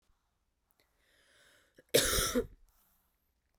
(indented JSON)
{
  "cough_length": "3.6 s",
  "cough_amplitude": 8161,
  "cough_signal_mean_std_ratio": 0.29,
  "survey_phase": "beta (2021-08-13 to 2022-03-07)",
  "age": "18-44",
  "gender": "Female",
  "wearing_mask": "No",
  "symptom_runny_or_blocked_nose": true,
  "symptom_sore_throat": true,
  "symptom_other": true,
  "smoker_status": "Never smoked",
  "respiratory_condition_asthma": false,
  "respiratory_condition_other": false,
  "recruitment_source": "Test and Trace",
  "submission_delay": "1 day",
  "covid_test_result": "Positive",
  "covid_test_method": "RT-qPCR",
  "covid_ct_value": 30.8,
  "covid_ct_gene": "N gene"
}